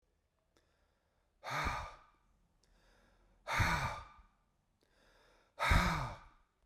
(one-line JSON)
{"exhalation_length": "6.7 s", "exhalation_amplitude": 4289, "exhalation_signal_mean_std_ratio": 0.37, "survey_phase": "beta (2021-08-13 to 2022-03-07)", "age": "45-64", "gender": "Male", "wearing_mask": "No", "symptom_none": true, "smoker_status": "Current smoker (1 to 10 cigarettes per day)", "respiratory_condition_asthma": false, "respiratory_condition_other": false, "recruitment_source": "REACT", "submission_delay": "2 days", "covid_test_result": "Negative", "covid_test_method": "RT-qPCR"}